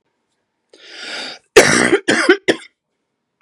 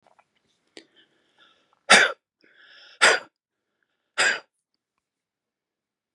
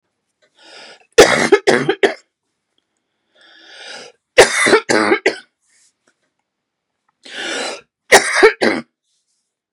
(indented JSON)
{
  "cough_length": "3.4 s",
  "cough_amplitude": 32768,
  "cough_signal_mean_std_ratio": 0.38,
  "exhalation_length": "6.1 s",
  "exhalation_amplitude": 32344,
  "exhalation_signal_mean_std_ratio": 0.23,
  "three_cough_length": "9.7 s",
  "three_cough_amplitude": 32768,
  "three_cough_signal_mean_std_ratio": 0.35,
  "survey_phase": "beta (2021-08-13 to 2022-03-07)",
  "age": "45-64",
  "gender": "Female",
  "wearing_mask": "No",
  "symptom_runny_or_blocked_nose": true,
  "symptom_onset": "12 days",
  "smoker_status": "Never smoked",
  "respiratory_condition_asthma": true,
  "respiratory_condition_other": false,
  "recruitment_source": "REACT",
  "submission_delay": "1 day",
  "covid_test_result": "Negative",
  "covid_test_method": "RT-qPCR",
  "influenza_a_test_result": "Negative",
  "influenza_b_test_result": "Negative"
}